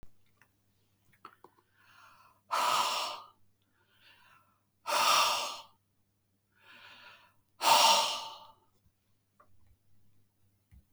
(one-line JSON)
{"exhalation_length": "10.9 s", "exhalation_amplitude": 10313, "exhalation_signal_mean_std_ratio": 0.34, "survey_phase": "beta (2021-08-13 to 2022-03-07)", "age": "65+", "gender": "Male", "wearing_mask": "No", "symptom_none": true, "smoker_status": "Ex-smoker", "respiratory_condition_asthma": false, "respiratory_condition_other": false, "recruitment_source": "REACT", "submission_delay": "6 days", "covid_test_result": "Negative", "covid_test_method": "RT-qPCR", "influenza_a_test_result": "Negative", "influenza_b_test_result": "Negative"}